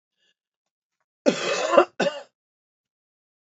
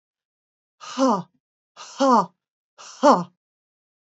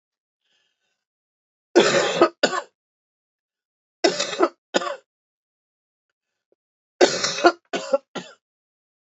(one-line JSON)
{"cough_length": "3.5 s", "cough_amplitude": 27607, "cough_signal_mean_std_ratio": 0.3, "exhalation_length": "4.2 s", "exhalation_amplitude": 24542, "exhalation_signal_mean_std_ratio": 0.33, "three_cough_length": "9.1 s", "three_cough_amplitude": 30013, "three_cough_signal_mean_std_ratio": 0.31, "survey_phase": "beta (2021-08-13 to 2022-03-07)", "age": "45-64", "gender": "Female", "wearing_mask": "No", "symptom_cough_any": true, "symptom_runny_or_blocked_nose": true, "symptom_sore_throat": true, "smoker_status": "Never smoked", "respiratory_condition_asthma": false, "respiratory_condition_other": false, "recruitment_source": "Test and Trace", "submission_delay": "2 days", "covid_test_result": "Positive", "covid_test_method": "RT-qPCR", "covid_ct_value": 17.3, "covid_ct_gene": "ORF1ab gene"}